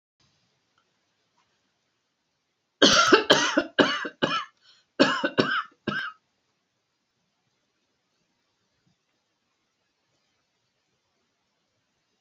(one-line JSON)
{"cough_length": "12.2 s", "cough_amplitude": 27151, "cough_signal_mean_std_ratio": 0.28, "survey_phase": "alpha (2021-03-01 to 2021-08-12)", "age": "65+", "gender": "Female", "wearing_mask": "No", "symptom_none": true, "smoker_status": "Never smoked", "respiratory_condition_asthma": false, "respiratory_condition_other": false, "recruitment_source": "REACT", "submission_delay": "2 days", "covid_test_result": "Negative", "covid_test_method": "RT-qPCR"}